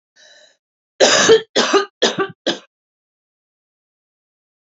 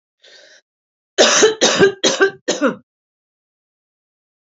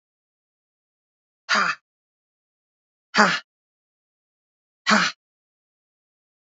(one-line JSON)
{"three_cough_length": "4.7 s", "three_cough_amplitude": 30353, "three_cough_signal_mean_std_ratio": 0.35, "cough_length": "4.4 s", "cough_amplitude": 30639, "cough_signal_mean_std_ratio": 0.4, "exhalation_length": "6.6 s", "exhalation_amplitude": 28698, "exhalation_signal_mean_std_ratio": 0.24, "survey_phase": "beta (2021-08-13 to 2022-03-07)", "age": "18-44", "gender": "Female", "wearing_mask": "No", "symptom_runny_or_blocked_nose": true, "symptom_sore_throat": true, "symptom_fatigue": true, "smoker_status": "Current smoker (1 to 10 cigarettes per day)", "respiratory_condition_asthma": false, "respiratory_condition_other": false, "recruitment_source": "Test and Trace", "submission_delay": "1 day", "covid_test_result": "Positive", "covid_test_method": "RT-qPCR", "covid_ct_value": 17.2, "covid_ct_gene": "ORF1ab gene", "covid_ct_mean": 17.7, "covid_viral_load": "1500000 copies/ml", "covid_viral_load_category": "High viral load (>1M copies/ml)"}